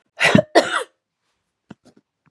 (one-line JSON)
{"cough_length": "2.3 s", "cough_amplitude": 32768, "cough_signal_mean_std_ratio": 0.31, "survey_phase": "beta (2021-08-13 to 2022-03-07)", "age": "45-64", "gender": "Female", "wearing_mask": "No", "symptom_runny_or_blocked_nose": true, "symptom_fatigue": true, "smoker_status": "Never smoked", "respiratory_condition_asthma": false, "respiratory_condition_other": false, "recruitment_source": "Test and Trace", "submission_delay": "1 day", "covid_test_result": "Positive", "covid_test_method": "RT-qPCR", "covid_ct_value": 28.4, "covid_ct_gene": "N gene"}